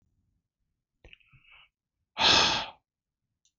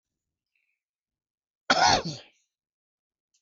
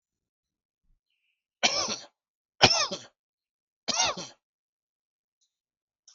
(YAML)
exhalation_length: 3.6 s
exhalation_amplitude: 11991
exhalation_signal_mean_std_ratio: 0.29
cough_length: 3.4 s
cough_amplitude: 14121
cough_signal_mean_std_ratio: 0.26
three_cough_length: 6.1 s
three_cough_amplitude: 30368
three_cough_signal_mean_std_ratio: 0.27
survey_phase: beta (2021-08-13 to 2022-03-07)
age: 18-44
gender: Male
wearing_mask: 'No'
symptom_none: true
smoker_status: Ex-smoker
respiratory_condition_asthma: false
respiratory_condition_other: false
recruitment_source: REACT
submission_delay: 1 day
covid_test_result: Negative
covid_test_method: RT-qPCR
influenza_a_test_result: Negative
influenza_b_test_result: Negative